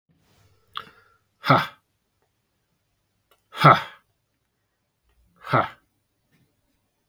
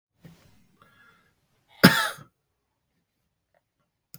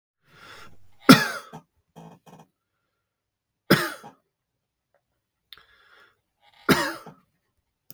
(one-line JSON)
{"exhalation_length": "7.1 s", "exhalation_amplitude": 32355, "exhalation_signal_mean_std_ratio": 0.21, "cough_length": "4.2 s", "cough_amplitude": 32768, "cough_signal_mean_std_ratio": 0.17, "three_cough_length": "7.9 s", "three_cough_amplitude": 32768, "three_cough_signal_mean_std_ratio": 0.2, "survey_phase": "beta (2021-08-13 to 2022-03-07)", "age": "45-64", "gender": "Male", "wearing_mask": "No", "symptom_cough_any": true, "symptom_new_continuous_cough": true, "symptom_runny_or_blocked_nose": true, "symptom_sore_throat": true, "symptom_headache": true, "symptom_onset": "6 days", "smoker_status": "Never smoked", "respiratory_condition_asthma": false, "respiratory_condition_other": false, "recruitment_source": "REACT", "submission_delay": "4 days", "covid_test_result": "Negative", "covid_test_method": "RT-qPCR", "influenza_a_test_result": "Negative", "influenza_b_test_result": "Negative"}